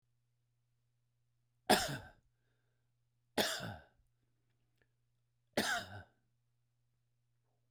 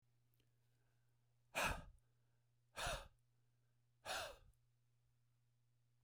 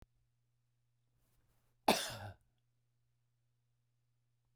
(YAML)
three_cough_length: 7.7 s
three_cough_amplitude: 7467
three_cough_signal_mean_std_ratio: 0.25
exhalation_length: 6.0 s
exhalation_amplitude: 1191
exhalation_signal_mean_std_ratio: 0.32
cough_length: 4.6 s
cough_amplitude: 5294
cough_signal_mean_std_ratio: 0.18
survey_phase: beta (2021-08-13 to 2022-03-07)
age: 45-64
gender: Male
wearing_mask: 'No'
symptom_none: true
smoker_status: Never smoked
respiratory_condition_asthma: false
respiratory_condition_other: false
recruitment_source: REACT
submission_delay: 2 days
covid_test_result: Negative
covid_test_method: RT-qPCR